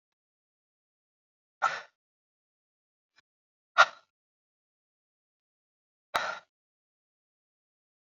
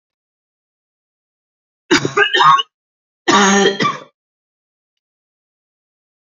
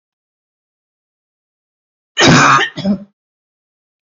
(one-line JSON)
{"exhalation_length": "8.0 s", "exhalation_amplitude": 16830, "exhalation_signal_mean_std_ratio": 0.14, "three_cough_length": "6.2 s", "three_cough_amplitude": 32767, "three_cough_signal_mean_std_ratio": 0.36, "cough_length": "4.1 s", "cough_amplitude": 32099, "cough_signal_mean_std_ratio": 0.34, "survey_phase": "beta (2021-08-13 to 2022-03-07)", "age": "45-64", "gender": "Female", "wearing_mask": "No", "symptom_cough_any": true, "symptom_runny_or_blocked_nose": true, "symptom_shortness_of_breath": true, "symptom_fatigue": true, "symptom_headache": true, "symptom_onset": "4 days", "smoker_status": "Current smoker (e-cigarettes or vapes only)", "respiratory_condition_asthma": false, "respiratory_condition_other": false, "recruitment_source": "Test and Trace", "submission_delay": "2 days", "covid_test_result": "Positive", "covid_test_method": "RT-qPCR", "covid_ct_value": 15.8, "covid_ct_gene": "ORF1ab gene", "covid_ct_mean": 16.3, "covid_viral_load": "4600000 copies/ml", "covid_viral_load_category": "High viral load (>1M copies/ml)"}